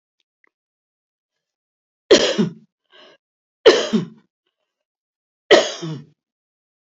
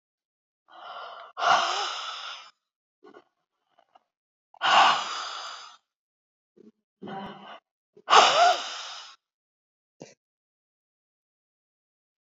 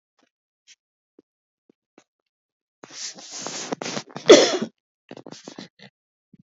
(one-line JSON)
{"three_cough_length": "7.0 s", "three_cough_amplitude": 29352, "three_cough_signal_mean_std_ratio": 0.26, "exhalation_length": "12.3 s", "exhalation_amplitude": 24987, "exhalation_signal_mean_std_ratio": 0.32, "cough_length": "6.5 s", "cough_amplitude": 30363, "cough_signal_mean_std_ratio": 0.21, "survey_phase": "beta (2021-08-13 to 2022-03-07)", "age": "65+", "gender": "Female", "wearing_mask": "No", "symptom_none": true, "smoker_status": "Never smoked", "respiratory_condition_asthma": false, "respiratory_condition_other": false, "recruitment_source": "REACT", "submission_delay": "2 days", "covid_test_result": "Negative", "covid_test_method": "RT-qPCR", "influenza_a_test_result": "Negative", "influenza_b_test_result": "Negative"}